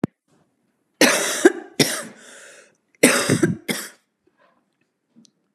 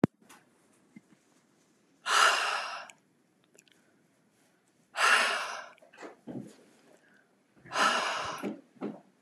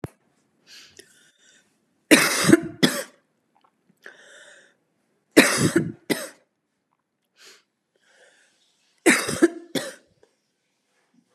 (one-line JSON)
{"cough_length": "5.5 s", "cough_amplitude": 32748, "cough_signal_mean_std_ratio": 0.35, "exhalation_length": "9.2 s", "exhalation_amplitude": 12341, "exhalation_signal_mean_std_ratio": 0.38, "three_cough_length": "11.3 s", "three_cough_amplitude": 32768, "three_cough_signal_mean_std_ratio": 0.28, "survey_phase": "beta (2021-08-13 to 2022-03-07)", "age": "45-64", "gender": "Female", "wearing_mask": "No", "symptom_cough_any": true, "symptom_runny_or_blocked_nose": true, "symptom_sore_throat": true, "smoker_status": "Ex-smoker", "respiratory_condition_asthma": false, "respiratory_condition_other": false, "recruitment_source": "REACT", "submission_delay": "1 day", "covid_test_result": "Negative", "covid_test_method": "RT-qPCR", "influenza_a_test_result": "Negative", "influenza_b_test_result": "Negative"}